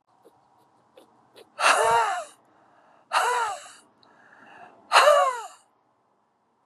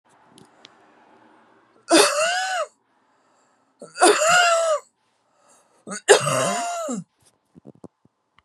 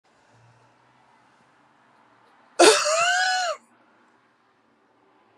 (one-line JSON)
{"exhalation_length": "6.7 s", "exhalation_amplitude": 21757, "exhalation_signal_mean_std_ratio": 0.39, "three_cough_length": "8.4 s", "three_cough_amplitude": 32164, "three_cough_signal_mean_std_ratio": 0.42, "cough_length": "5.4 s", "cough_amplitude": 31227, "cough_signal_mean_std_ratio": 0.32, "survey_phase": "beta (2021-08-13 to 2022-03-07)", "age": "45-64", "gender": "Female", "wearing_mask": "No", "symptom_none": true, "smoker_status": "Never smoked", "respiratory_condition_asthma": false, "respiratory_condition_other": false, "recruitment_source": "REACT", "submission_delay": "11 days", "covid_test_result": "Negative", "covid_test_method": "RT-qPCR"}